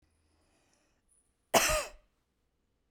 {"cough_length": "2.9 s", "cough_amplitude": 12005, "cough_signal_mean_std_ratio": 0.25, "survey_phase": "beta (2021-08-13 to 2022-03-07)", "age": "45-64", "gender": "Female", "wearing_mask": "No", "symptom_none": true, "smoker_status": "Never smoked", "respiratory_condition_asthma": false, "respiratory_condition_other": false, "recruitment_source": "REACT", "submission_delay": "1 day", "covid_test_result": "Negative", "covid_test_method": "RT-qPCR", "influenza_a_test_result": "Negative", "influenza_b_test_result": "Negative"}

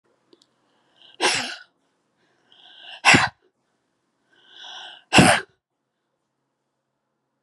{"exhalation_length": "7.4 s", "exhalation_amplitude": 30343, "exhalation_signal_mean_std_ratio": 0.25, "survey_phase": "beta (2021-08-13 to 2022-03-07)", "age": "65+", "gender": "Female", "wearing_mask": "No", "symptom_none": true, "smoker_status": "Never smoked", "respiratory_condition_asthma": false, "respiratory_condition_other": false, "recruitment_source": "REACT", "submission_delay": "1 day", "covid_test_result": "Negative", "covid_test_method": "RT-qPCR"}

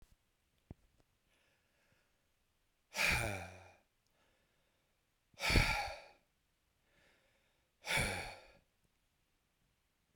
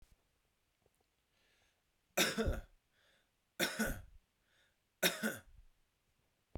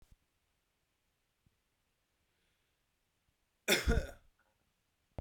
{"exhalation_length": "10.2 s", "exhalation_amplitude": 5118, "exhalation_signal_mean_std_ratio": 0.3, "three_cough_length": "6.6 s", "three_cough_amplitude": 4185, "three_cough_signal_mean_std_ratio": 0.32, "cough_length": "5.2 s", "cough_amplitude": 4862, "cough_signal_mean_std_ratio": 0.21, "survey_phase": "beta (2021-08-13 to 2022-03-07)", "age": "18-44", "gender": "Male", "wearing_mask": "No", "symptom_runny_or_blocked_nose": true, "symptom_sore_throat": true, "symptom_headache": true, "symptom_onset": "3 days", "smoker_status": "Ex-smoker", "respiratory_condition_asthma": false, "respiratory_condition_other": false, "recruitment_source": "Test and Trace", "submission_delay": "1 day", "covid_test_result": "Positive", "covid_test_method": "ePCR"}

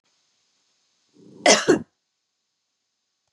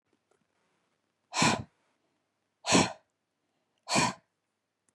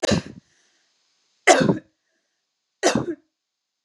{"cough_length": "3.3 s", "cough_amplitude": 30646, "cough_signal_mean_std_ratio": 0.23, "exhalation_length": "4.9 s", "exhalation_amplitude": 10612, "exhalation_signal_mean_std_ratio": 0.29, "three_cough_length": "3.8 s", "three_cough_amplitude": 31100, "three_cough_signal_mean_std_ratio": 0.32, "survey_phase": "beta (2021-08-13 to 2022-03-07)", "age": "45-64", "gender": "Female", "wearing_mask": "No", "symptom_none": true, "smoker_status": "Never smoked", "respiratory_condition_asthma": false, "respiratory_condition_other": false, "recruitment_source": "REACT", "submission_delay": "4 days", "covid_test_result": "Negative", "covid_test_method": "RT-qPCR", "influenza_a_test_result": "Negative", "influenza_b_test_result": "Negative"}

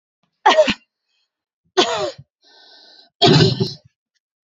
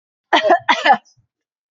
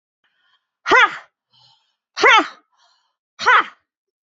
{"three_cough_length": "4.5 s", "three_cough_amplitude": 30893, "three_cough_signal_mean_std_ratio": 0.37, "cough_length": "1.7 s", "cough_amplitude": 28262, "cough_signal_mean_std_ratio": 0.43, "exhalation_length": "4.3 s", "exhalation_amplitude": 31939, "exhalation_signal_mean_std_ratio": 0.33, "survey_phase": "beta (2021-08-13 to 2022-03-07)", "age": "18-44", "gender": "Female", "wearing_mask": "No", "symptom_runny_or_blocked_nose": true, "symptom_sore_throat": true, "symptom_onset": "12 days", "smoker_status": "Never smoked", "respiratory_condition_asthma": false, "respiratory_condition_other": false, "recruitment_source": "REACT", "submission_delay": "0 days", "covid_test_result": "Negative", "covid_test_method": "RT-qPCR", "covid_ct_value": 39.0, "covid_ct_gene": "N gene", "influenza_a_test_result": "Negative", "influenza_b_test_result": "Negative"}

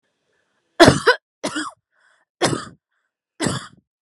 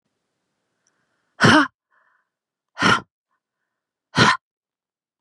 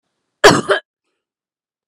{"three_cough_length": "4.0 s", "three_cough_amplitude": 32768, "three_cough_signal_mean_std_ratio": 0.29, "exhalation_length": "5.2 s", "exhalation_amplitude": 29518, "exhalation_signal_mean_std_ratio": 0.28, "cough_length": "1.9 s", "cough_amplitude": 32768, "cough_signal_mean_std_ratio": 0.28, "survey_phase": "beta (2021-08-13 to 2022-03-07)", "age": "45-64", "gender": "Female", "wearing_mask": "No", "symptom_none": true, "symptom_onset": "12 days", "smoker_status": "Never smoked", "respiratory_condition_asthma": false, "respiratory_condition_other": false, "recruitment_source": "REACT", "submission_delay": "2 days", "covid_test_result": "Negative", "covid_test_method": "RT-qPCR", "influenza_a_test_result": "Unknown/Void", "influenza_b_test_result": "Unknown/Void"}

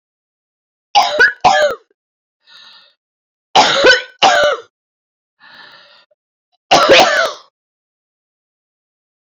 {"three_cough_length": "9.2 s", "three_cough_amplitude": 31487, "three_cough_signal_mean_std_ratio": 0.4, "survey_phase": "beta (2021-08-13 to 2022-03-07)", "age": "45-64", "gender": "Female", "wearing_mask": "No", "symptom_cough_any": true, "symptom_abdominal_pain": true, "symptom_fatigue": true, "symptom_headache": true, "symptom_change_to_sense_of_smell_or_taste": true, "smoker_status": "Never smoked", "respiratory_condition_asthma": true, "respiratory_condition_other": false, "recruitment_source": "Test and Trace", "submission_delay": "2 days", "covid_test_result": "Positive", "covid_test_method": "RT-qPCR"}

